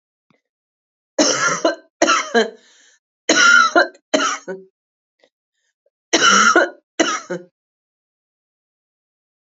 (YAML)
three_cough_length: 9.6 s
three_cough_amplitude: 30093
three_cough_signal_mean_std_ratio: 0.41
survey_phase: beta (2021-08-13 to 2022-03-07)
age: 45-64
gender: Female
wearing_mask: 'No'
symptom_cough_any: true
symptom_fatigue: true
smoker_status: Never smoked
respiratory_condition_asthma: false
respiratory_condition_other: false
recruitment_source: Test and Trace
submission_delay: 3 days
covid_test_result: Positive
covid_test_method: RT-qPCR
covid_ct_value: 17.2
covid_ct_gene: ORF1ab gene
covid_ct_mean: 17.8
covid_viral_load: 1500000 copies/ml
covid_viral_load_category: High viral load (>1M copies/ml)